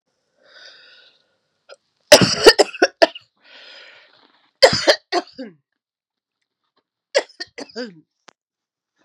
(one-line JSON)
{"three_cough_length": "9.0 s", "three_cough_amplitude": 32768, "three_cough_signal_mean_std_ratio": 0.24, "survey_phase": "beta (2021-08-13 to 2022-03-07)", "age": "45-64", "gender": "Female", "wearing_mask": "No", "symptom_cough_any": true, "symptom_runny_or_blocked_nose": true, "symptom_fatigue": true, "symptom_headache": true, "symptom_change_to_sense_of_smell_or_taste": true, "symptom_loss_of_taste": true, "symptom_onset": "13 days", "smoker_status": "Never smoked", "respiratory_condition_asthma": false, "respiratory_condition_other": false, "recruitment_source": "Test and Trace", "submission_delay": "2 days", "covid_test_result": "Positive", "covid_test_method": "RT-qPCR", "covid_ct_value": 29.0, "covid_ct_gene": "N gene"}